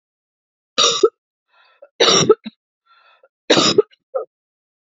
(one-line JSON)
{"three_cough_length": "4.9 s", "three_cough_amplitude": 29883, "three_cough_signal_mean_std_ratio": 0.34, "survey_phase": "beta (2021-08-13 to 2022-03-07)", "age": "45-64", "gender": "Female", "wearing_mask": "No", "symptom_cough_any": true, "symptom_runny_or_blocked_nose": true, "symptom_sore_throat": true, "smoker_status": "Never smoked", "recruitment_source": "Test and Trace", "submission_delay": "1 day", "covid_test_result": "Positive", "covid_test_method": "LFT"}